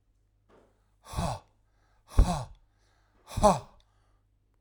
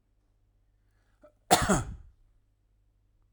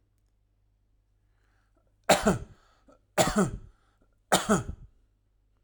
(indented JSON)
{
  "exhalation_length": "4.6 s",
  "exhalation_amplitude": 14167,
  "exhalation_signal_mean_std_ratio": 0.27,
  "cough_length": "3.3 s",
  "cough_amplitude": 19839,
  "cough_signal_mean_std_ratio": 0.25,
  "three_cough_length": "5.6 s",
  "three_cough_amplitude": 16129,
  "three_cough_signal_mean_std_ratio": 0.31,
  "survey_phase": "alpha (2021-03-01 to 2021-08-12)",
  "age": "45-64",
  "gender": "Male",
  "wearing_mask": "No",
  "symptom_none": true,
  "smoker_status": "Ex-smoker",
  "respiratory_condition_asthma": false,
  "respiratory_condition_other": false,
  "recruitment_source": "REACT",
  "submission_delay": "3 days",
  "covid_test_result": "Negative",
  "covid_test_method": "RT-qPCR",
  "covid_ct_value": 41.0,
  "covid_ct_gene": "N gene"
}